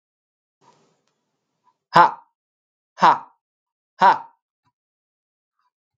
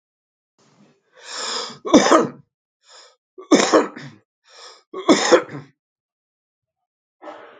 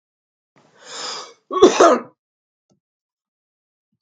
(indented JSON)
{
  "exhalation_length": "6.0 s",
  "exhalation_amplitude": 32767,
  "exhalation_signal_mean_std_ratio": 0.21,
  "three_cough_length": "7.6 s",
  "three_cough_amplitude": 32767,
  "three_cough_signal_mean_std_ratio": 0.32,
  "cough_length": "4.0 s",
  "cough_amplitude": 32767,
  "cough_signal_mean_std_ratio": 0.27,
  "survey_phase": "beta (2021-08-13 to 2022-03-07)",
  "age": "18-44",
  "gender": "Male",
  "wearing_mask": "No",
  "symptom_cough_any": true,
  "symptom_runny_or_blocked_nose": true,
  "smoker_status": "Never smoked",
  "respiratory_condition_asthma": true,
  "respiratory_condition_other": false,
  "recruitment_source": "Test and Trace",
  "submission_delay": "0 days",
  "covid_test_result": "Positive",
  "covid_test_method": "LFT"
}